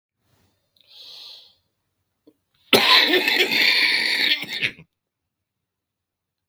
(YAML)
cough_length: 6.5 s
cough_amplitude: 32767
cough_signal_mean_std_ratio: 0.43
survey_phase: beta (2021-08-13 to 2022-03-07)
age: 65+
gender: Male
wearing_mask: 'No'
symptom_cough_any: true
symptom_new_continuous_cough: true
symptom_sore_throat: true
symptom_abdominal_pain: true
symptom_fatigue: true
symptom_fever_high_temperature: true
symptom_headache: true
symptom_other: true
symptom_onset: 3 days
smoker_status: Ex-smoker
respiratory_condition_asthma: false
respiratory_condition_other: false
recruitment_source: Test and Trace
submission_delay: 3 days
covid_test_result: Positive
covid_test_method: RT-qPCR
covid_ct_value: 11.7
covid_ct_gene: ORF1ab gene
covid_ct_mean: 12.1
covid_viral_load: 110000000 copies/ml
covid_viral_load_category: High viral load (>1M copies/ml)